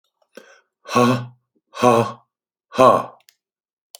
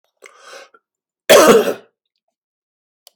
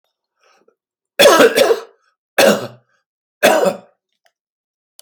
exhalation_length: 4.0 s
exhalation_amplitude: 30506
exhalation_signal_mean_std_ratio: 0.36
cough_length: 3.2 s
cough_amplitude: 32768
cough_signal_mean_std_ratio: 0.31
three_cough_length: 5.0 s
three_cough_amplitude: 32768
three_cough_signal_mean_std_ratio: 0.38
survey_phase: alpha (2021-03-01 to 2021-08-12)
age: 65+
gender: Male
wearing_mask: 'No'
symptom_cough_any: true
symptom_headache: true
smoker_status: Ex-smoker
respiratory_condition_asthma: false
respiratory_condition_other: false
recruitment_source: REACT
submission_delay: 1 day
covid_test_result: Negative
covid_test_method: RT-qPCR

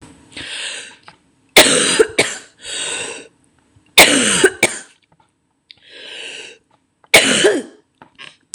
three_cough_length: 8.5 s
three_cough_amplitude: 26028
three_cough_signal_mean_std_ratio: 0.4
survey_phase: beta (2021-08-13 to 2022-03-07)
age: 18-44
gender: Female
wearing_mask: 'No'
symptom_cough_any: true
symptom_new_continuous_cough: true
smoker_status: Never smoked
respiratory_condition_asthma: false
respiratory_condition_other: false
recruitment_source: REACT
submission_delay: 3 days
covid_test_result: Negative
covid_test_method: RT-qPCR
influenza_a_test_result: Negative
influenza_b_test_result: Negative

